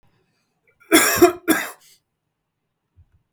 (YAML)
cough_length: 3.3 s
cough_amplitude: 32768
cough_signal_mean_std_ratio: 0.31
survey_phase: beta (2021-08-13 to 2022-03-07)
age: 45-64
gender: Male
wearing_mask: 'No'
symptom_none: true
smoker_status: Never smoked
respiratory_condition_asthma: false
respiratory_condition_other: false
recruitment_source: REACT
submission_delay: 5 days
covid_test_result: Negative
covid_test_method: RT-qPCR
influenza_a_test_result: Negative
influenza_b_test_result: Negative